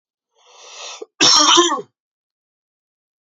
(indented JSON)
{
  "cough_length": "3.2 s",
  "cough_amplitude": 29523,
  "cough_signal_mean_std_ratio": 0.37,
  "survey_phase": "beta (2021-08-13 to 2022-03-07)",
  "age": "18-44",
  "gender": "Male",
  "wearing_mask": "No",
  "symptom_sore_throat": true,
  "symptom_abdominal_pain": true,
  "symptom_headache": true,
  "symptom_onset": "3 days",
  "smoker_status": "Ex-smoker",
  "respiratory_condition_asthma": false,
  "respiratory_condition_other": false,
  "recruitment_source": "Test and Trace",
  "submission_delay": "2 days",
  "covid_test_result": "Positive",
  "covid_test_method": "RT-qPCR",
  "covid_ct_value": 18.2,
  "covid_ct_gene": "N gene"
}